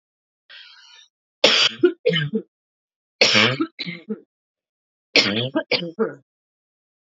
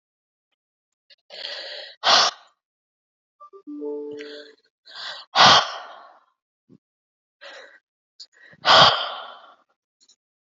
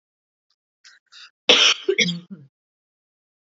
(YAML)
three_cough_length: 7.2 s
three_cough_amplitude: 32768
three_cough_signal_mean_std_ratio: 0.4
exhalation_length: 10.5 s
exhalation_amplitude: 31451
exhalation_signal_mean_std_ratio: 0.29
cough_length: 3.6 s
cough_amplitude: 29837
cough_signal_mean_std_ratio: 0.3
survey_phase: beta (2021-08-13 to 2022-03-07)
age: 18-44
gender: Female
wearing_mask: 'No'
symptom_cough_any: true
symptom_runny_or_blocked_nose: true
symptom_shortness_of_breath: true
symptom_sore_throat: true
symptom_abdominal_pain: true
symptom_onset: 10 days
smoker_status: Ex-smoker
respiratory_condition_asthma: false
respiratory_condition_other: false
recruitment_source: REACT
submission_delay: 2 days
covid_test_result: Negative
covid_test_method: RT-qPCR
influenza_a_test_result: Negative
influenza_b_test_result: Negative